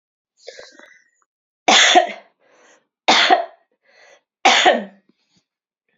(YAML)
three_cough_length: 6.0 s
three_cough_amplitude: 31179
three_cough_signal_mean_std_ratio: 0.36
survey_phase: alpha (2021-03-01 to 2021-08-12)
age: 18-44
gender: Female
wearing_mask: 'No'
symptom_cough_any: true
symptom_fatigue: true
symptom_fever_high_temperature: true
symptom_headache: true
symptom_onset: 3 days
smoker_status: Never smoked
respiratory_condition_asthma: false
respiratory_condition_other: false
recruitment_source: Test and Trace
submission_delay: 2 days
covid_test_result: Positive
covid_test_method: RT-qPCR
covid_ct_value: 19.5
covid_ct_gene: ORF1ab gene
covid_ct_mean: 20.6
covid_viral_load: 170000 copies/ml
covid_viral_load_category: Low viral load (10K-1M copies/ml)